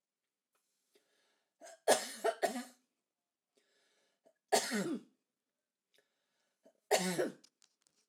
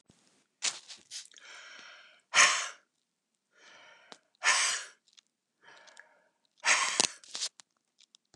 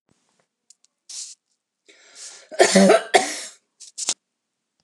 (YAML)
three_cough_length: 8.1 s
three_cough_amplitude: 5583
three_cough_signal_mean_std_ratio: 0.3
exhalation_length: 8.4 s
exhalation_amplitude: 22032
exhalation_signal_mean_std_ratio: 0.31
cough_length: 4.8 s
cough_amplitude: 28840
cough_signal_mean_std_ratio: 0.3
survey_phase: alpha (2021-03-01 to 2021-08-12)
age: 45-64
gender: Female
wearing_mask: 'No'
symptom_none: true
smoker_status: Ex-smoker
respiratory_condition_asthma: false
respiratory_condition_other: false
recruitment_source: REACT
submission_delay: 1 day
covid_test_result: Negative
covid_test_method: RT-qPCR